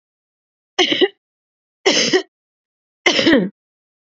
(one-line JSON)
{"three_cough_length": "4.1 s", "three_cough_amplitude": 32767, "three_cough_signal_mean_std_ratio": 0.4, "survey_phase": "beta (2021-08-13 to 2022-03-07)", "age": "18-44", "gender": "Female", "wearing_mask": "No", "symptom_none": true, "smoker_status": "Never smoked", "respiratory_condition_asthma": false, "respiratory_condition_other": false, "recruitment_source": "Test and Trace", "submission_delay": "1 day", "covid_test_result": "Positive", "covid_test_method": "RT-qPCR", "covid_ct_value": 29.8, "covid_ct_gene": "ORF1ab gene"}